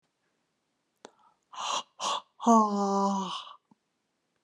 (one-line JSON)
{"exhalation_length": "4.4 s", "exhalation_amplitude": 11442, "exhalation_signal_mean_std_ratio": 0.42, "survey_phase": "alpha (2021-03-01 to 2021-08-12)", "age": "45-64", "gender": "Female", "wearing_mask": "No", "symptom_none": true, "smoker_status": "Never smoked", "respiratory_condition_asthma": false, "respiratory_condition_other": false, "recruitment_source": "REACT", "submission_delay": "1 day", "covid_test_result": "Negative", "covid_test_method": "RT-qPCR"}